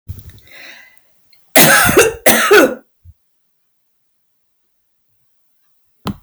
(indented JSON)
{
  "cough_length": "6.2 s",
  "cough_amplitude": 32768,
  "cough_signal_mean_std_ratio": 0.36,
  "survey_phase": "alpha (2021-03-01 to 2021-08-12)",
  "age": "65+",
  "gender": "Female",
  "wearing_mask": "No",
  "symptom_none": true,
  "smoker_status": "Never smoked",
  "respiratory_condition_asthma": false,
  "respiratory_condition_other": false,
  "recruitment_source": "REACT",
  "submission_delay": "2 days",
  "covid_test_result": "Negative",
  "covid_test_method": "RT-qPCR"
}